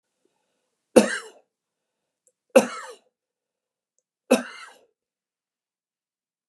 {
  "three_cough_length": "6.5 s",
  "three_cough_amplitude": 32768,
  "three_cough_signal_mean_std_ratio": 0.18,
  "survey_phase": "beta (2021-08-13 to 2022-03-07)",
  "age": "65+",
  "gender": "Male",
  "wearing_mask": "No",
  "symptom_none": true,
  "smoker_status": "Ex-smoker",
  "respiratory_condition_asthma": false,
  "respiratory_condition_other": false,
  "recruitment_source": "REACT",
  "submission_delay": "1 day",
  "covid_test_result": "Negative",
  "covid_test_method": "RT-qPCR",
  "influenza_a_test_result": "Negative",
  "influenza_b_test_result": "Negative"
}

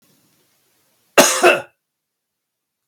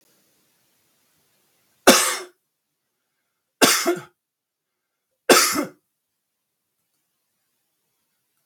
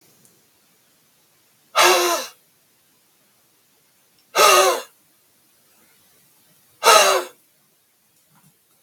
{
  "cough_length": "2.9 s",
  "cough_amplitude": 32768,
  "cough_signal_mean_std_ratio": 0.28,
  "three_cough_length": "8.5 s",
  "three_cough_amplitude": 32768,
  "three_cough_signal_mean_std_ratio": 0.25,
  "exhalation_length": "8.8 s",
  "exhalation_amplitude": 32768,
  "exhalation_signal_mean_std_ratio": 0.31,
  "survey_phase": "beta (2021-08-13 to 2022-03-07)",
  "age": "45-64",
  "gender": "Male",
  "wearing_mask": "No",
  "symptom_none": true,
  "smoker_status": "Never smoked",
  "respiratory_condition_asthma": true,
  "respiratory_condition_other": false,
  "recruitment_source": "REACT",
  "submission_delay": "9 days",
  "covid_test_result": "Negative",
  "covid_test_method": "RT-qPCR",
  "influenza_a_test_result": "Unknown/Void",
  "influenza_b_test_result": "Unknown/Void"
}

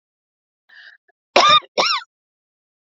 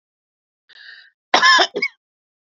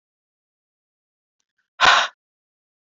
{
  "three_cough_length": "2.8 s",
  "three_cough_amplitude": 28911,
  "three_cough_signal_mean_std_ratio": 0.33,
  "cough_length": "2.6 s",
  "cough_amplitude": 29476,
  "cough_signal_mean_std_ratio": 0.33,
  "exhalation_length": "2.9 s",
  "exhalation_amplitude": 31482,
  "exhalation_signal_mean_std_ratio": 0.23,
  "survey_phase": "beta (2021-08-13 to 2022-03-07)",
  "age": "45-64",
  "gender": "Female",
  "wearing_mask": "No",
  "symptom_none": true,
  "symptom_onset": "12 days",
  "smoker_status": "Ex-smoker",
  "respiratory_condition_asthma": false,
  "respiratory_condition_other": false,
  "recruitment_source": "REACT",
  "submission_delay": "1 day",
  "covid_test_result": "Negative",
  "covid_test_method": "RT-qPCR",
  "influenza_a_test_result": "Negative",
  "influenza_b_test_result": "Negative"
}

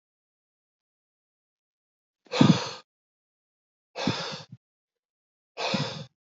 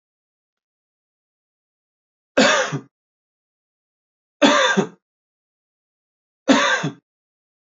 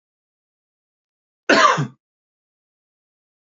{
  "exhalation_length": "6.4 s",
  "exhalation_amplitude": 22133,
  "exhalation_signal_mean_std_ratio": 0.26,
  "three_cough_length": "7.8 s",
  "three_cough_amplitude": 28722,
  "three_cough_signal_mean_std_ratio": 0.31,
  "cough_length": "3.6 s",
  "cough_amplitude": 27060,
  "cough_signal_mean_std_ratio": 0.25,
  "survey_phase": "alpha (2021-03-01 to 2021-08-12)",
  "age": "45-64",
  "gender": "Male",
  "wearing_mask": "No",
  "symptom_none": true,
  "smoker_status": "Never smoked",
  "respiratory_condition_asthma": false,
  "respiratory_condition_other": false,
  "recruitment_source": "REACT",
  "submission_delay": "2 days",
  "covid_test_result": "Negative",
  "covid_test_method": "RT-qPCR"
}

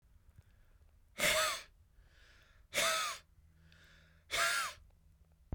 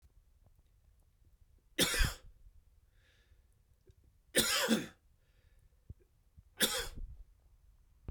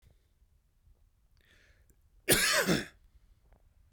{
  "exhalation_length": "5.5 s",
  "exhalation_amplitude": 4565,
  "exhalation_signal_mean_std_ratio": 0.43,
  "three_cough_length": "8.1 s",
  "three_cough_amplitude": 5972,
  "three_cough_signal_mean_std_ratio": 0.33,
  "cough_length": "3.9 s",
  "cough_amplitude": 11646,
  "cough_signal_mean_std_ratio": 0.32,
  "survey_phase": "beta (2021-08-13 to 2022-03-07)",
  "age": "18-44",
  "gender": "Male",
  "wearing_mask": "No",
  "symptom_none": true,
  "smoker_status": "Ex-smoker",
  "respiratory_condition_asthma": false,
  "respiratory_condition_other": false,
  "recruitment_source": "REACT",
  "submission_delay": "0 days",
  "covid_test_result": "Negative",
  "covid_test_method": "RT-qPCR"
}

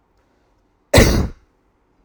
{
  "cough_length": "2.0 s",
  "cough_amplitude": 32768,
  "cough_signal_mean_std_ratio": 0.32,
  "survey_phase": "alpha (2021-03-01 to 2021-08-12)",
  "age": "18-44",
  "gender": "Male",
  "wearing_mask": "No",
  "symptom_none": true,
  "smoker_status": "Never smoked",
  "respiratory_condition_asthma": false,
  "respiratory_condition_other": false,
  "recruitment_source": "REACT",
  "submission_delay": "2 days",
  "covid_test_result": "Negative",
  "covid_test_method": "RT-qPCR"
}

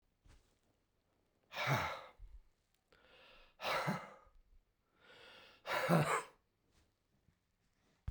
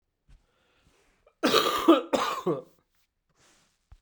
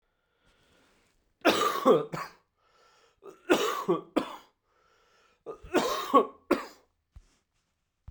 {
  "exhalation_length": "8.1 s",
  "exhalation_amplitude": 3637,
  "exhalation_signal_mean_std_ratio": 0.36,
  "cough_length": "4.0 s",
  "cough_amplitude": 18865,
  "cough_signal_mean_std_ratio": 0.37,
  "three_cough_length": "8.1 s",
  "three_cough_amplitude": 12924,
  "three_cough_signal_mean_std_ratio": 0.36,
  "survey_phase": "beta (2021-08-13 to 2022-03-07)",
  "age": "45-64",
  "gender": "Male",
  "wearing_mask": "No",
  "symptom_cough_any": true,
  "symptom_runny_or_blocked_nose": true,
  "symptom_shortness_of_breath": true,
  "symptom_fatigue": true,
  "symptom_fever_high_temperature": true,
  "symptom_change_to_sense_of_smell_or_taste": true,
  "symptom_loss_of_taste": true,
  "symptom_onset": "2 days",
  "smoker_status": "Never smoked",
  "respiratory_condition_asthma": false,
  "respiratory_condition_other": false,
  "recruitment_source": "Test and Trace",
  "submission_delay": "2 days",
  "covid_test_result": "Positive",
  "covid_test_method": "RT-qPCR",
  "covid_ct_value": 14.8,
  "covid_ct_gene": "ORF1ab gene",
  "covid_ct_mean": 15.4,
  "covid_viral_load": "9200000 copies/ml",
  "covid_viral_load_category": "High viral load (>1M copies/ml)"
}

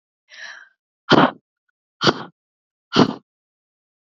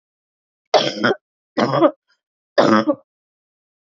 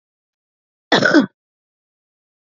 {
  "exhalation_length": "4.2 s",
  "exhalation_amplitude": 27906,
  "exhalation_signal_mean_std_ratio": 0.27,
  "three_cough_length": "3.8 s",
  "three_cough_amplitude": 29447,
  "three_cough_signal_mean_std_ratio": 0.39,
  "cough_length": "2.6 s",
  "cough_amplitude": 32116,
  "cough_signal_mean_std_ratio": 0.28,
  "survey_phase": "beta (2021-08-13 to 2022-03-07)",
  "age": "45-64",
  "gender": "Female",
  "wearing_mask": "No",
  "symptom_cough_any": true,
  "symptom_runny_or_blocked_nose": true,
  "symptom_sore_throat": true,
  "symptom_headache": true,
  "smoker_status": "Ex-smoker",
  "respiratory_condition_asthma": false,
  "respiratory_condition_other": false,
  "recruitment_source": "Test and Trace",
  "submission_delay": "1 day",
  "covid_test_result": "Positive",
  "covid_test_method": "RT-qPCR",
  "covid_ct_value": 17.7,
  "covid_ct_gene": "N gene"
}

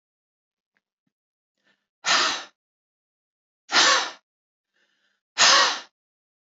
{
  "exhalation_length": "6.5 s",
  "exhalation_amplitude": 22370,
  "exhalation_signal_mean_std_ratio": 0.32,
  "survey_phase": "beta (2021-08-13 to 2022-03-07)",
  "age": "45-64",
  "gender": "Female",
  "wearing_mask": "No",
  "symptom_cough_any": true,
  "symptom_runny_or_blocked_nose": true,
  "symptom_onset": "3 days",
  "smoker_status": "Never smoked",
  "respiratory_condition_asthma": false,
  "respiratory_condition_other": false,
  "recruitment_source": "Test and Trace",
  "submission_delay": "1 day",
  "covid_test_result": "Negative",
  "covid_test_method": "RT-qPCR"
}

